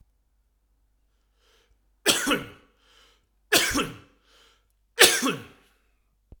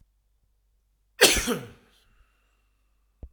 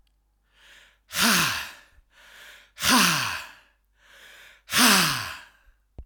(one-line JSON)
{"three_cough_length": "6.4 s", "three_cough_amplitude": 28702, "three_cough_signal_mean_std_ratio": 0.3, "cough_length": "3.3 s", "cough_amplitude": 26337, "cough_signal_mean_std_ratio": 0.24, "exhalation_length": "6.1 s", "exhalation_amplitude": 20622, "exhalation_signal_mean_std_ratio": 0.43, "survey_phase": "alpha (2021-03-01 to 2021-08-12)", "age": "45-64", "gender": "Male", "wearing_mask": "No", "symptom_none": true, "smoker_status": "Ex-smoker", "respiratory_condition_asthma": true, "respiratory_condition_other": false, "recruitment_source": "REACT", "submission_delay": "6 days", "covid_test_result": "Negative", "covid_test_method": "RT-qPCR"}